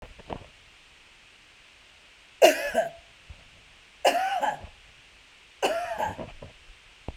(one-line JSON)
{"three_cough_length": "7.2 s", "three_cough_amplitude": 20770, "three_cough_signal_mean_std_ratio": 0.36, "survey_phase": "beta (2021-08-13 to 2022-03-07)", "age": "45-64", "gender": "Female", "wearing_mask": "No", "symptom_sore_throat": true, "symptom_fatigue": true, "symptom_onset": "13 days", "smoker_status": "Ex-smoker", "respiratory_condition_asthma": false, "respiratory_condition_other": false, "recruitment_source": "REACT", "submission_delay": "3 days", "covid_test_result": "Negative", "covid_test_method": "RT-qPCR"}